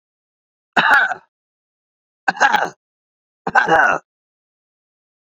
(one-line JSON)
{"three_cough_length": "5.2 s", "three_cough_amplitude": 29908, "three_cough_signal_mean_std_ratio": 0.37, "survey_phase": "beta (2021-08-13 to 2022-03-07)", "age": "45-64", "gender": "Male", "wearing_mask": "No", "symptom_none": true, "smoker_status": "Never smoked", "respiratory_condition_asthma": false, "respiratory_condition_other": false, "recruitment_source": "REACT", "submission_delay": "1 day", "covid_test_result": "Negative", "covid_test_method": "RT-qPCR"}